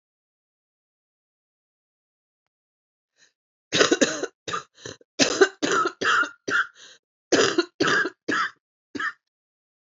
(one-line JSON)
{"cough_length": "9.9 s", "cough_amplitude": 28378, "cough_signal_mean_std_ratio": 0.38, "survey_phase": "beta (2021-08-13 to 2022-03-07)", "age": "45-64", "gender": "Female", "wearing_mask": "No", "symptom_cough_any": true, "symptom_new_continuous_cough": true, "symptom_runny_or_blocked_nose": true, "symptom_shortness_of_breath": true, "symptom_sore_throat": true, "symptom_diarrhoea": true, "symptom_fatigue": true, "symptom_fever_high_temperature": true, "symptom_headache": true, "symptom_onset": "3 days", "smoker_status": "Ex-smoker", "respiratory_condition_asthma": false, "respiratory_condition_other": false, "recruitment_source": "Test and Trace", "submission_delay": "1 day", "covid_test_result": "Positive", "covid_test_method": "RT-qPCR", "covid_ct_value": 21.9, "covid_ct_gene": "ORF1ab gene"}